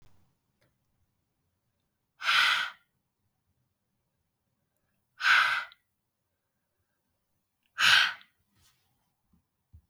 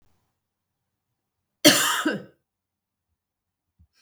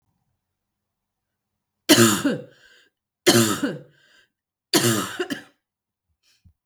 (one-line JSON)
{"exhalation_length": "9.9 s", "exhalation_amplitude": 11892, "exhalation_signal_mean_std_ratio": 0.27, "cough_length": "4.0 s", "cough_amplitude": 32165, "cough_signal_mean_std_ratio": 0.25, "three_cough_length": "6.7 s", "three_cough_amplitude": 32768, "three_cough_signal_mean_std_ratio": 0.34, "survey_phase": "beta (2021-08-13 to 2022-03-07)", "age": "18-44", "gender": "Female", "wearing_mask": "No", "symptom_cough_any": true, "symptom_runny_or_blocked_nose": true, "symptom_fever_high_temperature": true, "symptom_change_to_sense_of_smell_or_taste": true, "symptom_loss_of_taste": true, "symptom_other": true, "symptom_onset": "4 days", "smoker_status": "Ex-smoker", "respiratory_condition_asthma": false, "respiratory_condition_other": false, "recruitment_source": "Test and Trace", "submission_delay": "1 day", "covid_test_result": "Positive", "covid_test_method": "RT-qPCR", "covid_ct_value": 18.8, "covid_ct_gene": "ORF1ab gene", "covid_ct_mean": 19.3, "covid_viral_load": "480000 copies/ml", "covid_viral_load_category": "Low viral load (10K-1M copies/ml)"}